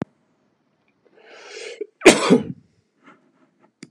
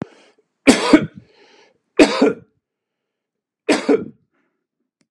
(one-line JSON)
{"cough_length": "3.9 s", "cough_amplitude": 32768, "cough_signal_mean_std_ratio": 0.24, "three_cough_length": "5.1 s", "three_cough_amplitude": 32768, "three_cough_signal_mean_std_ratio": 0.31, "survey_phase": "beta (2021-08-13 to 2022-03-07)", "age": "45-64", "gender": "Male", "wearing_mask": "No", "symptom_none": true, "smoker_status": "Never smoked", "respiratory_condition_asthma": false, "respiratory_condition_other": false, "recruitment_source": "REACT", "submission_delay": "1 day", "covid_test_result": "Negative", "covid_test_method": "RT-qPCR", "influenza_a_test_result": "Negative", "influenza_b_test_result": "Negative"}